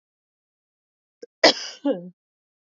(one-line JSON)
{"cough_length": "2.7 s", "cough_amplitude": 29676, "cough_signal_mean_std_ratio": 0.23, "survey_phase": "beta (2021-08-13 to 2022-03-07)", "age": "18-44", "gender": "Female", "wearing_mask": "No", "symptom_cough_any": true, "symptom_runny_or_blocked_nose": true, "symptom_onset": "4 days", "smoker_status": "Ex-smoker", "respiratory_condition_asthma": false, "respiratory_condition_other": false, "recruitment_source": "REACT", "submission_delay": "4 days", "covid_test_result": "Negative", "covid_test_method": "RT-qPCR", "influenza_a_test_result": "Negative", "influenza_b_test_result": "Negative"}